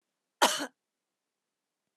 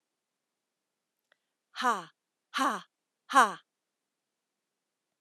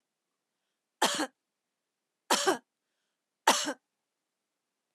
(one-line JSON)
{"cough_length": "2.0 s", "cough_amplitude": 12554, "cough_signal_mean_std_ratio": 0.23, "exhalation_length": "5.2 s", "exhalation_amplitude": 13056, "exhalation_signal_mean_std_ratio": 0.23, "three_cough_length": "4.9 s", "three_cough_amplitude": 16514, "three_cough_signal_mean_std_ratio": 0.27, "survey_phase": "alpha (2021-03-01 to 2021-08-12)", "age": "45-64", "gender": "Female", "wearing_mask": "No", "symptom_none": true, "smoker_status": "Never smoked", "respiratory_condition_asthma": false, "respiratory_condition_other": false, "recruitment_source": "REACT", "submission_delay": "1 day", "covid_test_result": "Negative", "covid_test_method": "RT-qPCR"}